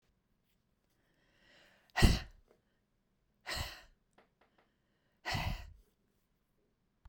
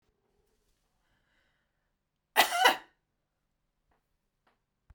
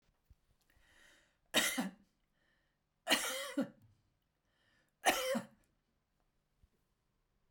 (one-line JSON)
{"exhalation_length": "7.1 s", "exhalation_amplitude": 10524, "exhalation_signal_mean_std_ratio": 0.22, "cough_length": "4.9 s", "cough_amplitude": 12507, "cough_signal_mean_std_ratio": 0.2, "three_cough_length": "7.5 s", "three_cough_amplitude": 5099, "three_cough_signal_mean_std_ratio": 0.31, "survey_phase": "beta (2021-08-13 to 2022-03-07)", "age": "65+", "gender": "Female", "wearing_mask": "No", "symptom_none": true, "smoker_status": "Ex-smoker", "respiratory_condition_asthma": false, "respiratory_condition_other": false, "recruitment_source": "REACT", "submission_delay": "1 day", "covid_test_result": "Negative", "covid_test_method": "RT-qPCR", "influenza_a_test_result": "Negative", "influenza_b_test_result": "Negative"}